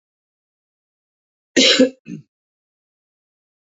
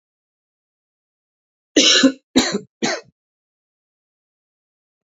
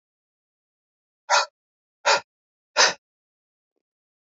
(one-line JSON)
{"cough_length": "3.8 s", "cough_amplitude": 30619, "cough_signal_mean_std_ratio": 0.24, "three_cough_length": "5.0 s", "three_cough_amplitude": 29374, "three_cough_signal_mean_std_ratio": 0.28, "exhalation_length": "4.4 s", "exhalation_amplitude": 22028, "exhalation_signal_mean_std_ratio": 0.24, "survey_phase": "beta (2021-08-13 to 2022-03-07)", "age": "45-64", "gender": "Male", "wearing_mask": "No", "symptom_cough_any": true, "symptom_runny_or_blocked_nose": true, "symptom_onset": "2 days", "smoker_status": "Never smoked", "respiratory_condition_asthma": false, "respiratory_condition_other": false, "recruitment_source": "Test and Trace", "submission_delay": "2 days", "covid_test_result": "Positive", "covid_test_method": "ePCR"}